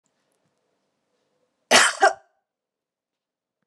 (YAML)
cough_length: 3.7 s
cough_amplitude: 28400
cough_signal_mean_std_ratio: 0.23
survey_phase: beta (2021-08-13 to 2022-03-07)
age: 45-64
gender: Female
wearing_mask: 'No'
symptom_cough_any: true
symptom_runny_or_blocked_nose: true
symptom_sore_throat: true
symptom_fatigue: true
symptom_change_to_sense_of_smell_or_taste: true
symptom_loss_of_taste: true
symptom_onset: 4 days
smoker_status: Never smoked
respiratory_condition_asthma: false
respiratory_condition_other: false
recruitment_source: Test and Trace
submission_delay: 2 days
covid_test_result: Positive
covid_test_method: RT-qPCR
covid_ct_value: 18.3
covid_ct_gene: ORF1ab gene
covid_ct_mean: 18.8
covid_viral_load: 690000 copies/ml
covid_viral_load_category: Low viral load (10K-1M copies/ml)